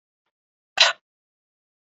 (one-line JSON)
{"cough_length": "2.0 s", "cough_amplitude": 27139, "cough_signal_mean_std_ratio": 0.19, "survey_phase": "beta (2021-08-13 to 2022-03-07)", "age": "18-44", "gender": "Male", "wearing_mask": "No", "symptom_runny_or_blocked_nose": true, "symptom_headache": true, "symptom_other": true, "symptom_onset": "8 days", "smoker_status": "Never smoked", "respiratory_condition_asthma": false, "respiratory_condition_other": false, "recruitment_source": "REACT", "submission_delay": "1 day", "covid_test_result": "Negative", "covid_test_method": "RT-qPCR", "influenza_a_test_result": "Negative", "influenza_b_test_result": "Negative"}